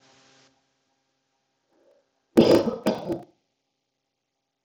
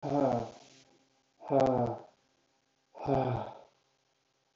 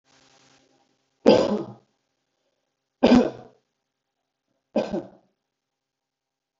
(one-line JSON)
{"cough_length": "4.6 s", "cough_amplitude": 24827, "cough_signal_mean_std_ratio": 0.25, "exhalation_length": "4.6 s", "exhalation_amplitude": 6560, "exhalation_signal_mean_std_ratio": 0.43, "three_cough_length": "6.6 s", "three_cough_amplitude": 25262, "three_cough_signal_mean_std_ratio": 0.25, "survey_phase": "beta (2021-08-13 to 2022-03-07)", "age": "18-44", "gender": "Male", "wearing_mask": "No", "symptom_none": true, "smoker_status": "Never smoked", "respiratory_condition_asthma": false, "respiratory_condition_other": false, "recruitment_source": "REACT", "submission_delay": "2 days", "covid_test_result": "Negative", "covid_test_method": "RT-qPCR"}